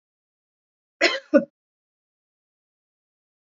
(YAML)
cough_length: 3.5 s
cough_amplitude: 25660
cough_signal_mean_std_ratio: 0.19
survey_phase: beta (2021-08-13 to 2022-03-07)
age: 45-64
gender: Female
wearing_mask: 'No'
symptom_none: true
smoker_status: Never smoked
respiratory_condition_asthma: false
respiratory_condition_other: false
recruitment_source: REACT
submission_delay: 1 day
covid_test_result: Negative
covid_test_method: RT-qPCR
influenza_a_test_result: Negative
influenza_b_test_result: Negative